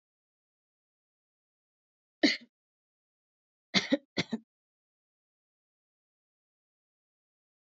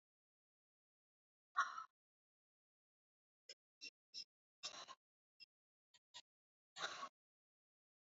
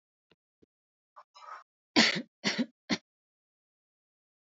three_cough_length: 7.8 s
three_cough_amplitude: 8700
three_cough_signal_mean_std_ratio: 0.16
exhalation_length: 8.0 s
exhalation_amplitude: 1385
exhalation_signal_mean_std_ratio: 0.22
cough_length: 4.4 s
cough_amplitude: 13405
cough_signal_mean_std_ratio: 0.25
survey_phase: alpha (2021-03-01 to 2021-08-12)
age: 18-44
gender: Female
wearing_mask: 'No'
symptom_none: true
smoker_status: Never smoked
respiratory_condition_asthma: false
respiratory_condition_other: false
recruitment_source: REACT
submission_delay: 1 day
covid_test_result: Negative
covid_test_method: RT-qPCR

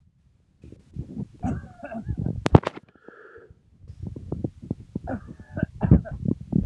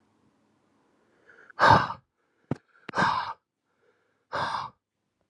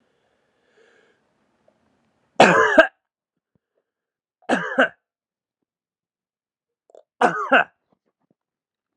cough_length: 6.7 s
cough_amplitude: 32768
cough_signal_mean_std_ratio: 0.34
exhalation_length: 5.3 s
exhalation_amplitude: 21903
exhalation_signal_mean_std_ratio: 0.3
three_cough_length: 9.0 s
three_cough_amplitude: 32767
three_cough_signal_mean_std_ratio: 0.25
survey_phase: alpha (2021-03-01 to 2021-08-12)
age: 18-44
gender: Male
wearing_mask: 'No'
symptom_cough_any: true
symptom_fatigue: true
symptom_headache: true
symptom_onset: 3 days
smoker_status: Never smoked
respiratory_condition_asthma: false
respiratory_condition_other: false
recruitment_source: Test and Trace
submission_delay: 2 days
covid_test_result: Positive
covid_test_method: RT-qPCR
covid_ct_value: 15.4
covid_ct_gene: ORF1ab gene
covid_ct_mean: 15.9
covid_viral_load: 6300000 copies/ml
covid_viral_load_category: High viral load (>1M copies/ml)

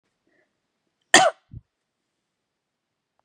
cough_length: 3.2 s
cough_amplitude: 32767
cough_signal_mean_std_ratio: 0.17
survey_phase: beta (2021-08-13 to 2022-03-07)
age: 18-44
gender: Female
wearing_mask: 'No'
symptom_none: true
symptom_onset: 8 days
smoker_status: Never smoked
respiratory_condition_asthma: false
respiratory_condition_other: false
recruitment_source: REACT
submission_delay: 4 days
covid_test_result: Negative
covid_test_method: RT-qPCR
influenza_a_test_result: Negative
influenza_b_test_result: Negative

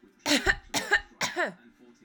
three_cough_length: 2.0 s
three_cough_amplitude: 10011
three_cough_signal_mean_std_ratio: 0.49
survey_phase: alpha (2021-03-01 to 2021-08-12)
age: 18-44
gender: Female
wearing_mask: 'No'
symptom_none: true
smoker_status: Never smoked
respiratory_condition_asthma: true
respiratory_condition_other: false
recruitment_source: REACT
submission_delay: 3 days
covid_test_result: Negative
covid_test_method: RT-qPCR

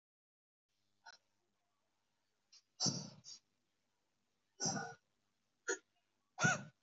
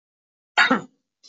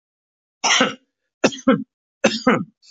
exhalation_length: 6.8 s
exhalation_amplitude: 3068
exhalation_signal_mean_std_ratio: 0.27
cough_length: 1.3 s
cough_amplitude: 22484
cough_signal_mean_std_ratio: 0.32
three_cough_length: 2.9 s
three_cough_amplitude: 26035
three_cough_signal_mean_std_ratio: 0.4
survey_phase: alpha (2021-03-01 to 2021-08-12)
age: 45-64
gender: Male
wearing_mask: 'No'
symptom_none: true
symptom_onset: 12 days
smoker_status: Never smoked
respiratory_condition_asthma: false
respiratory_condition_other: false
recruitment_source: REACT
submission_delay: 3 days
covid_test_result: Negative
covid_test_method: RT-qPCR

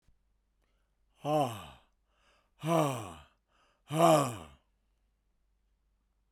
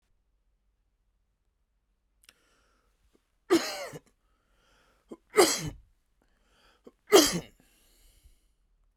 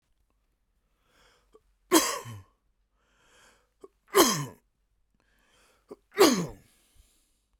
exhalation_length: 6.3 s
exhalation_amplitude: 9379
exhalation_signal_mean_std_ratio: 0.33
three_cough_length: 9.0 s
three_cough_amplitude: 17900
three_cough_signal_mean_std_ratio: 0.22
cough_length: 7.6 s
cough_amplitude: 24449
cough_signal_mean_std_ratio: 0.25
survey_phase: beta (2021-08-13 to 2022-03-07)
age: 45-64
gender: Male
wearing_mask: 'No'
symptom_none: true
smoker_status: Never smoked
respiratory_condition_asthma: false
respiratory_condition_other: false
recruitment_source: REACT
submission_delay: 1 day
covid_test_result: Negative
covid_test_method: RT-qPCR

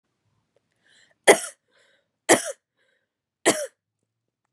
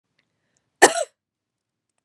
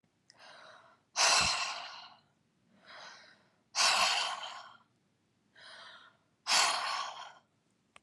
three_cough_length: 4.5 s
three_cough_amplitude: 32231
three_cough_signal_mean_std_ratio: 0.21
cough_length: 2.0 s
cough_amplitude: 32768
cough_signal_mean_std_ratio: 0.18
exhalation_length: 8.0 s
exhalation_amplitude: 6734
exhalation_signal_mean_std_ratio: 0.43
survey_phase: beta (2021-08-13 to 2022-03-07)
age: 45-64
gender: Female
wearing_mask: 'No'
symptom_new_continuous_cough: true
symptom_runny_or_blocked_nose: true
symptom_change_to_sense_of_smell_or_taste: true
symptom_loss_of_taste: true
smoker_status: Never smoked
respiratory_condition_asthma: false
respiratory_condition_other: false
recruitment_source: Test and Trace
submission_delay: 2 days
covid_test_result: Positive
covid_test_method: LFT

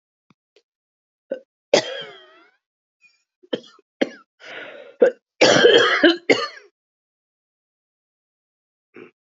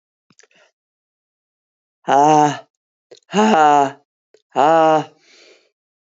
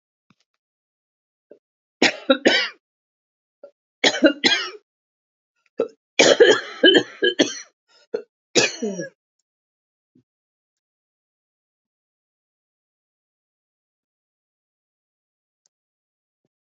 cough_length: 9.3 s
cough_amplitude: 31515
cough_signal_mean_std_ratio: 0.29
exhalation_length: 6.1 s
exhalation_amplitude: 32552
exhalation_signal_mean_std_ratio: 0.4
three_cough_length: 16.7 s
three_cough_amplitude: 28656
three_cough_signal_mean_std_ratio: 0.26
survey_phase: alpha (2021-03-01 to 2021-08-12)
age: 45-64
gender: Female
wearing_mask: 'No'
symptom_cough_any: true
symptom_shortness_of_breath: true
symptom_fatigue: true
symptom_headache: true
symptom_change_to_sense_of_smell_or_taste: true
smoker_status: Never smoked
respiratory_condition_asthma: false
respiratory_condition_other: false
recruitment_source: Test and Trace
submission_delay: 2 days
covid_test_result: Positive
covid_test_method: RT-qPCR
covid_ct_value: 16.1
covid_ct_gene: ORF1ab gene
covid_ct_mean: 17.2
covid_viral_load: 2300000 copies/ml
covid_viral_load_category: High viral load (>1M copies/ml)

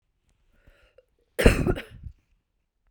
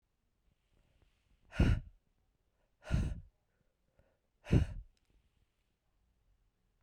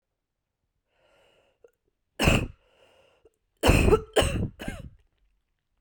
cough_length: 2.9 s
cough_amplitude: 30710
cough_signal_mean_std_ratio: 0.26
exhalation_length: 6.8 s
exhalation_amplitude: 5438
exhalation_signal_mean_std_ratio: 0.25
three_cough_length: 5.8 s
three_cough_amplitude: 18469
three_cough_signal_mean_std_ratio: 0.33
survey_phase: beta (2021-08-13 to 2022-03-07)
age: 18-44
gender: Female
wearing_mask: 'No'
symptom_cough_any: true
symptom_new_continuous_cough: true
symptom_runny_or_blocked_nose: true
symptom_fatigue: true
symptom_other: true
symptom_onset: 2 days
smoker_status: Ex-smoker
respiratory_condition_asthma: false
respiratory_condition_other: false
recruitment_source: Test and Trace
submission_delay: 2 days
covid_test_result: Positive
covid_test_method: RT-qPCR
covid_ct_value: 16.5
covid_ct_gene: ORF1ab gene
covid_ct_mean: 17.0
covid_viral_load: 2700000 copies/ml
covid_viral_load_category: High viral load (>1M copies/ml)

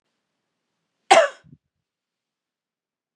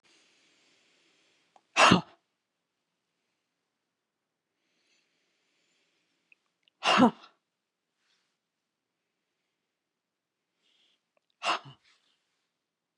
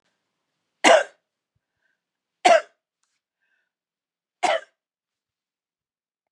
cough_length: 3.2 s
cough_amplitude: 32513
cough_signal_mean_std_ratio: 0.18
exhalation_length: 13.0 s
exhalation_amplitude: 17715
exhalation_signal_mean_std_ratio: 0.17
three_cough_length: 6.3 s
three_cough_amplitude: 28922
three_cough_signal_mean_std_ratio: 0.21
survey_phase: beta (2021-08-13 to 2022-03-07)
age: 65+
gender: Female
wearing_mask: 'No'
symptom_none: true
smoker_status: Never smoked
respiratory_condition_asthma: false
respiratory_condition_other: false
recruitment_source: REACT
submission_delay: 2 days
covid_test_result: Negative
covid_test_method: RT-qPCR
influenza_a_test_result: Negative
influenza_b_test_result: Negative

